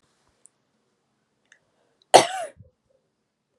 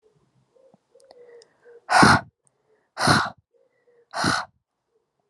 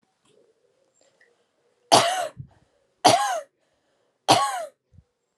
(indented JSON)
{
  "cough_length": "3.6 s",
  "cough_amplitude": 32768,
  "cough_signal_mean_std_ratio": 0.15,
  "exhalation_length": "5.3 s",
  "exhalation_amplitude": 29214,
  "exhalation_signal_mean_std_ratio": 0.31,
  "three_cough_length": "5.4 s",
  "three_cough_amplitude": 31821,
  "three_cough_signal_mean_std_ratio": 0.32,
  "survey_phase": "alpha (2021-03-01 to 2021-08-12)",
  "age": "18-44",
  "gender": "Female",
  "wearing_mask": "No",
  "symptom_change_to_sense_of_smell_or_taste": true,
  "symptom_onset": "7 days",
  "smoker_status": "Current smoker (e-cigarettes or vapes only)",
  "respiratory_condition_asthma": false,
  "respiratory_condition_other": false,
  "recruitment_source": "Test and Trace",
  "submission_delay": "2 days",
  "covid_test_result": "Positive",
  "covid_test_method": "RT-qPCR",
  "covid_ct_value": 25.6,
  "covid_ct_gene": "ORF1ab gene",
  "covid_ct_mean": 26.0,
  "covid_viral_load": "3000 copies/ml",
  "covid_viral_load_category": "Minimal viral load (< 10K copies/ml)"
}